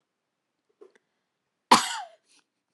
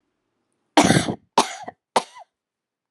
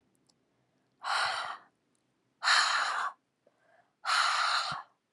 {"cough_length": "2.7 s", "cough_amplitude": 23606, "cough_signal_mean_std_ratio": 0.19, "three_cough_length": "2.9 s", "three_cough_amplitude": 29256, "three_cough_signal_mean_std_ratio": 0.31, "exhalation_length": "5.1 s", "exhalation_amplitude": 8938, "exhalation_signal_mean_std_ratio": 0.51, "survey_phase": "alpha (2021-03-01 to 2021-08-12)", "age": "18-44", "gender": "Female", "wearing_mask": "No", "symptom_none": true, "smoker_status": "Never smoked", "respiratory_condition_asthma": false, "respiratory_condition_other": false, "recruitment_source": "REACT", "submission_delay": "0 days", "covid_test_result": "Negative", "covid_test_method": "RT-qPCR"}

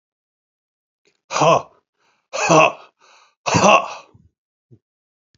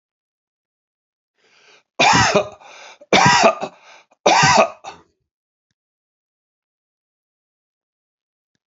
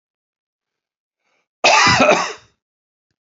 {"exhalation_length": "5.4 s", "exhalation_amplitude": 31514, "exhalation_signal_mean_std_ratio": 0.34, "three_cough_length": "8.7 s", "three_cough_amplitude": 32767, "three_cough_signal_mean_std_ratio": 0.33, "cough_length": "3.2 s", "cough_amplitude": 30670, "cough_signal_mean_std_ratio": 0.37, "survey_phase": "beta (2021-08-13 to 2022-03-07)", "age": "65+", "gender": "Male", "wearing_mask": "No", "symptom_runny_or_blocked_nose": true, "smoker_status": "Never smoked", "respiratory_condition_asthma": true, "respiratory_condition_other": false, "recruitment_source": "REACT", "submission_delay": "3 days", "covid_test_result": "Negative", "covid_test_method": "RT-qPCR", "influenza_a_test_result": "Negative", "influenza_b_test_result": "Negative"}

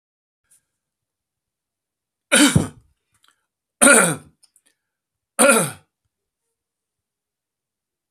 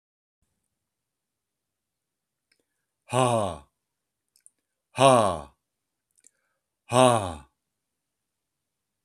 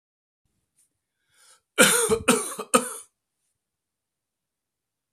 {"three_cough_length": "8.1 s", "three_cough_amplitude": 32768, "three_cough_signal_mean_std_ratio": 0.26, "exhalation_length": "9.0 s", "exhalation_amplitude": 23915, "exhalation_signal_mean_std_ratio": 0.24, "cough_length": "5.1 s", "cough_amplitude": 25101, "cough_signal_mean_std_ratio": 0.29, "survey_phase": "alpha (2021-03-01 to 2021-08-12)", "age": "65+", "gender": "Male", "wearing_mask": "No", "symptom_cough_any": true, "smoker_status": "Never smoked", "respiratory_condition_asthma": false, "respiratory_condition_other": false, "recruitment_source": "REACT", "submission_delay": "2 days", "covid_test_result": "Negative", "covid_test_method": "RT-qPCR"}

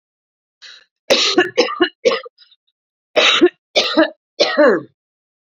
{"cough_length": "5.5 s", "cough_amplitude": 32543, "cough_signal_mean_std_ratio": 0.46, "survey_phase": "beta (2021-08-13 to 2022-03-07)", "age": "45-64", "gender": "Female", "wearing_mask": "No", "symptom_none": true, "smoker_status": "Ex-smoker", "respiratory_condition_asthma": false, "respiratory_condition_other": false, "recruitment_source": "REACT", "submission_delay": "2 days", "covid_test_result": "Negative", "covid_test_method": "RT-qPCR"}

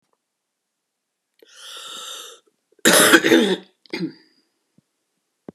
{"cough_length": "5.5 s", "cough_amplitude": 32768, "cough_signal_mean_std_ratio": 0.31, "survey_phase": "beta (2021-08-13 to 2022-03-07)", "age": "45-64", "gender": "Female", "wearing_mask": "No", "symptom_cough_any": true, "symptom_runny_or_blocked_nose": true, "symptom_sore_throat": true, "symptom_headache": true, "symptom_change_to_sense_of_smell_or_taste": true, "symptom_loss_of_taste": true, "symptom_onset": "3 days", "smoker_status": "Ex-smoker", "respiratory_condition_asthma": false, "respiratory_condition_other": false, "recruitment_source": "Test and Trace", "submission_delay": "2 days", "covid_test_result": "Positive", "covid_test_method": "RT-qPCR"}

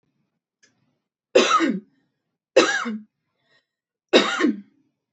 {"three_cough_length": "5.1 s", "three_cough_amplitude": 28050, "three_cough_signal_mean_std_ratio": 0.36, "survey_phase": "beta (2021-08-13 to 2022-03-07)", "age": "18-44", "gender": "Female", "wearing_mask": "No", "symptom_none": true, "smoker_status": "Never smoked", "respiratory_condition_asthma": true, "respiratory_condition_other": false, "recruitment_source": "REACT", "submission_delay": "2 days", "covid_test_result": "Negative", "covid_test_method": "RT-qPCR", "influenza_a_test_result": "Negative", "influenza_b_test_result": "Negative"}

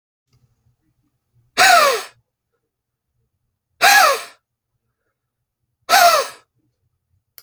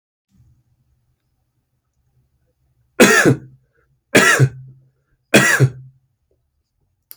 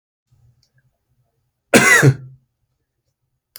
{"exhalation_length": "7.4 s", "exhalation_amplitude": 32582, "exhalation_signal_mean_std_ratio": 0.32, "three_cough_length": "7.2 s", "three_cough_amplitude": 32768, "three_cough_signal_mean_std_ratio": 0.32, "cough_length": "3.6 s", "cough_amplitude": 32768, "cough_signal_mean_std_ratio": 0.28, "survey_phase": "beta (2021-08-13 to 2022-03-07)", "age": "45-64", "gender": "Male", "wearing_mask": "No", "symptom_runny_or_blocked_nose": true, "symptom_sore_throat": true, "symptom_fatigue": true, "symptom_fever_high_temperature": true, "symptom_onset": "5 days", "smoker_status": "Current smoker (e-cigarettes or vapes only)", "respiratory_condition_asthma": true, "respiratory_condition_other": false, "recruitment_source": "Test and Trace", "submission_delay": "2 days", "covid_test_result": "Positive", "covid_test_method": "ePCR"}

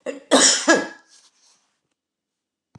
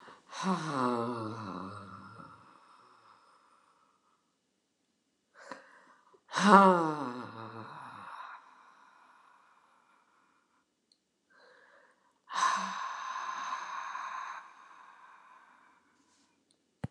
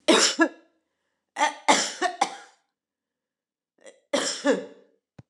{"cough_length": "2.8 s", "cough_amplitude": 28077, "cough_signal_mean_std_ratio": 0.35, "exhalation_length": "16.9 s", "exhalation_amplitude": 20244, "exhalation_signal_mean_std_ratio": 0.31, "three_cough_length": "5.3 s", "three_cough_amplitude": 23015, "three_cough_signal_mean_std_ratio": 0.39, "survey_phase": "beta (2021-08-13 to 2022-03-07)", "age": "65+", "gender": "Female", "wearing_mask": "No", "symptom_none": true, "smoker_status": "Ex-smoker", "respiratory_condition_asthma": true, "respiratory_condition_other": false, "recruitment_source": "REACT", "submission_delay": "1 day", "covid_test_result": "Negative", "covid_test_method": "RT-qPCR"}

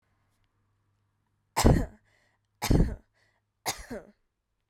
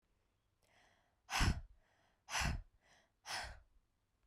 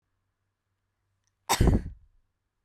{"three_cough_length": "4.7 s", "three_cough_amplitude": 16732, "three_cough_signal_mean_std_ratio": 0.28, "exhalation_length": "4.3 s", "exhalation_amplitude": 2497, "exhalation_signal_mean_std_ratio": 0.35, "cough_length": "2.6 s", "cough_amplitude": 11630, "cough_signal_mean_std_ratio": 0.28, "survey_phase": "beta (2021-08-13 to 2022-03-07)", "age": "18-44", "gender": "Female", "wearing_mask": "Yes", "symptom_cough_any": true, "symptom_runny_or_blocked_nose": true, "symptom_headache": true, "symptom_change_to_sense_of_smell_or_taste": true, "smoker_status": "Never smoked", "respiratory_condition_asthma": false, "respiratory_condition_other": false, "recruitment_source": "Test and Trace", "submission_delay": "3 days", "covid_test_result": "Positive", "covid_test_method": "RT-qPCR", "covid_ct_value": 29.9, "covid_ct_gene": "ORF1ab gene", "covid_ct_mean": 30.5, "covid_viral_load": "97 copies/ml", "covid_viral_load_category": "Minimal viral load (< 10K copies/ml)"}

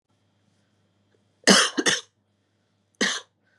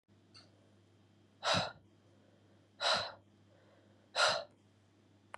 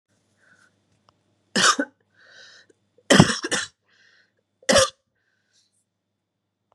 {"cough_length": "3.6 s", "cough_amplitude": 31466, "cough_signal_mean_std_ratio": 0.29, "exhalation_length": "5.4 s", "exhalation_amplitude": 4171, "exhalation_signal_mean_std_ratio": 0.34, "three_cough_length": "6.7 s", "three_cough_amplitude": 32767, "three_cough_signal_mean_std_ratio": 0.26, "survey_phase": "beta (2021-08-13 to 2022-03-07)", "age": "18-44", "gender": "Female", "wearing_mask": "No", "symptom_cough_any": true, "symptom_runny_or_blocked_nose": true, "symptom_shortness_of_breath": true, "symptom_sore_throat": true, "symptom_fatigue": true, "symptom_fever_high_temperature": true, "symptom_onset": "2 days", "smoker_status": "Never smoked", "respiratory_condition_asthma": true, "respiratory_condition_other": false, "recruitment_source": "Test and Trace", "submission_delay": "2 days", "covid_test_result": "Positive", "covid_test_method": "ePCR"}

